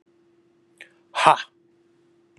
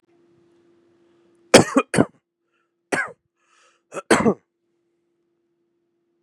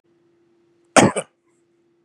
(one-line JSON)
{"exhalation_length": "2.4 s", "exhalation_amplitude": 32768, "exhalation_signal_mean_std_ratio": 0.21, "three_cough_length": "6.2 s", "three_cough_amplitude": 32768, "three_cough_signal_mean_std_ratio": 0.23, "cough_length": "2.0 s", "cough_amplitude": 32768, "cough_signal_mean_std_ratio": 0.23, "survey_phase": "beta (2021-08-13 to 2022-03-07)", "age": "45-64", "gender": "Male", "wearing_mask": "No", "symptom_cough_any": true, "symptom_runny_or_blocked_nose": true, "symptom_fatigue": true, "symptom_onset": "12 days", "smoker_status": "Never smoked", "respiratory_condition_asthma": false, "respiratory_condition_other": false, "recruitment_source": "REACT", "submission_delay": "2 days", "covid_test_result": "Negative", "covid_test_method": "RT-qPCR", "influenza_a_test_result": "Negative", "influenza_b_test_result": "Negative"}